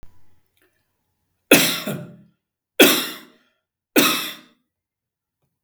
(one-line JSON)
{"three_cough_length": "5.6 s", "three_cough_amplitude": 32767, "three_cough_signal_mean_std_ratio": 0.31, "survey_phase": "beta (2021-08-13 to 2022-03-07)", "age": "65+", "gender": "Male", "wearing_mask": "No", "symptom_none": true, "smoker_status": "Never smoked", "respiratory_condition_asthma": false, "respiratory_condition_other": false, "recruitment_source": "REACT", "submission_delay": "3 days", "covid_test_result": "Negative", "covid_test_method": "RT-qPCR", "influenza_a_test_result": "Negative", "influenza_b_test_result": "Negative"}